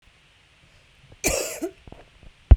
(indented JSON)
{
  "cough_length": "2.6 s",
  "cough_amplitude": 32768,
  "cough_signal_mean_std_ratio": 0.22,
  "survey_phase": "beta (2021-08-13 to 2022-03-07)",
  "age": "18-44",
  "gender": "Female",
  "wearing_mask": "No",
  "symptom_cough_any": true,
  "symptom_sore_throat": true,
  "symptom_onset": "5 days",
  "smoker_status": "Current smoker (1 to 10 cigarettes per day)",
  "respiratory_condition_asthma": true,
  "respiratory_condition_other": false,
  "recruitment_source": "REACT",
  "submission_delay": "1 day",
  "covid_test_result": "Negative",
  "covid_test_method": "RT-qPCR"
}